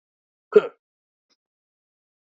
{"cough_length": "2.2 s", "cough_amplitude": 26383, "cough_signal_mean_std_ratio": 0.14, "survey_phase": "alpha (2021-03-01 to 2021-08-12)", "age": "18-44", "gender": "Male", "wearing_mask": "No", "symptom_cough_any": true, "symptom_fatigue": true, "symptom_onset": "2 days", "smoker_status": "Current smoker (1 to 10 cigarettes per day)", "respiratory_condition_asthma": false, "respiratory_condition_other": false, "recruitment_source": "Test and Trace", "submission_delay": "1 day", "covid_test_result": "Positive", "covid_test_method": "RT-qPCR"}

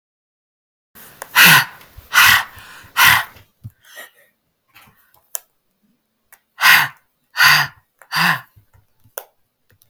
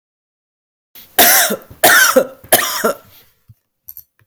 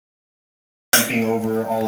{"exhalation_length": "9.9 s", "exhalation_amplitude": 32768, "exhalation_signal_mean_std_ratio": 0.34, "three_cough_length": "4.3 s", "three_cough_amplitude": 32768, "three_cough_signal_mean_std_ratio": 0.43, "cough_length": "1.9 s", "cough_amplitude": 32768, "cough_signal_mean_std_ratio": 0.59, "survey_phase": "beta (2021-08-13 to 2022-03-07)", "age": "45-64", "gender": "Female", "wearing_mask": "No", "symptom_none": true, "symptom_onset": "12 days", "smoker_status": "Never smoked", "respiratory_condition_asthma": false, "respiratory_condition_other": false, "recruitment_source": "REACT", "submission_delay": "3 days", "covid_test_result": "Negative", "covid_test_method": "RT-qPCR", "influenza_a_test_result": "Negative", "influenza_b_test_result": "Negative"}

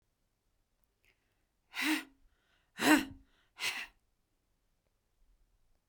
{"exhalation_length": "5.9 s", "exhalation_amplitude": 7772, "exhalation_signal_mean_std_ratio": 0.25, "survey_phase": "beta (2021-08-13 to 2022-03-07)", "age": "65+", "gender": "Female", "wearing_mask": "No", "symptom_none": true, "smoker_status": "Never smoked", "respiratory_condition_asthma": false, "respiratory_condition_other": false, "recruitment_source": "REACT", "submission_delay": "1 day", "covid_test_result": "Negative", "covid_test_method": "RT-qPCR", "influenza_a_test_result": "Negative", "influenza_b_test_result": "Negative"}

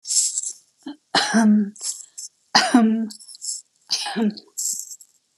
{"three_cough_length": "5.4 s", "three_cough_amplitude": 27565, "three_cough_signal_mean_std_ratio": 0.54, "survey_phase": "beta (2021-08-13 to 2022-03-07)", "age": "65+", "gender": "Female", "wearing_mask": "No", "symptom_none": true, "smoker_status": "Never smoked", "respiratory_condition_asthma": true, "respiratory_condition_other": false, "recruitment_source": "REACT", "submission_delay": "1 day", "covid_test_result": "Negative", "covid_test_method": "RT-qPCR"}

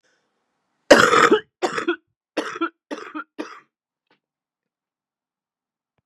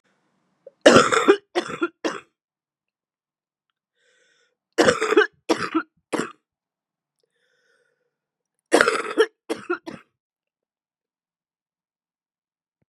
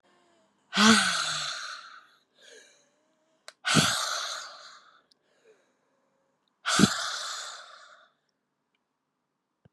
{"cough_length": "6.1 s", "cough_amplitude": 32768, "cough_signal_mean_std_ratio": 0.28, "three_cough_length": "12.9 s", "three_cough_amplitude": 32768, "three_cough_signal_mean_std_ratio": 0.28, "exhalation_length": "9.7 s", "exhalation_amplitude": 17435, "exhalation_signal_mean_std_ratio": 0.36, "survey_phase": "beta (2021-08-13 to 2022-03-07)", "age": "18-44", "gender": "Female", "wearing_mask": "No", "symptom_cough_any": true, "symptom_runny_or_blocked_nose": true, "symptom_sore_throat": true, "symptom_fatigue": true, "symptom_headache": true, "smoker_status": "Ex-smoker", "respiratory_condition_asthma": false, "respiratory_condition_other": false, "recruitment_source": "Test and Trace", "submission_delay": "2 days", "covid_test_result": "Positive", "covid_test_method": "LFT"}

